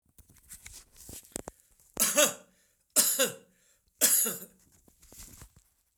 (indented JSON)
{
  "three_cough_length": "6.0 s",
  "three_cough_amplitude": 17185,
  "three_cough_signal_mean_std_ratio": 0.35,
  "survey_phase": "beta (2021-08-13 to 2022-03-07)",
  "age": "65+",
  "gender": "Male",
  "wearing_mask": "No",
  "symptom_none": true,
  "smoker_status": "Ex-smoker",
  "respiratory_condition_asthma": false,
  "respiratory_condition_other": false,
  "recruitment_source": "REACT",
  "submission_delay": "2 days",
  "covid_test_result": "Negative",
  "covid_test_method": "RT-qPCR",
  "influenza_a_test_result": "Negative",
  "influenza_b_test_result": "Negative"
}